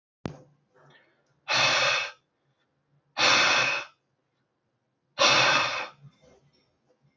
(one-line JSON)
{"exhalation_length": "7.2 s", "exhalation_amplitude": 13071, "exhalation_signal_mean_std_ratio": 0.43, "survey_phase": "beta (2021-08-13 to 2022-03-07)", "age": "18-44", "gender": "Male", "wearing_mask": "No", "symptom_cough_any": true, "symptom_sore_throat": true, "symptom_onset": "2 days", "smoker_status": "Never smoked", "respiratory_condition_asthma": false, "respiratory_condition_other": false, "recruitment_source": "Test and Trace", "submission_delay": "1 day", "covid_test_result": "Positive", "covid_test_method": "RT-qPCR", "covid_ct_value": 23.1, "covid_ct_gene": "N gene", "covid_ct_mean": 23.2, "covid_viral_load": "24000 copies/ml", "covid_viral_load_category": "Low viral load (10K-1M copies/ml)"}